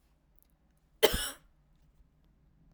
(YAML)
cough_length: 2.7 s
cough_amplitude: 13419
cough_signal_mean_std_ratio: 0.21
survey_phase: beta (2021-08-13 to 2022-03-07)
age: 18-44
gender: Female
wearing_mask: 'No'
symptom_cough_any: true
symptom_runny_or_blocked_nose: true
symptom_fatigue: true
symptom_onset: 9 days
smoker_status: Never smoked
respiratory_condition_asthma: true
respiratory_condition_other: false
recruitment_source: REACT
submission_delay: 4 days
covid_test_result: Negative
covid_test_method: RT-qPCR
influenza_a_test_result: Unknown/Void
influenza_b_test_result: Unknown/Void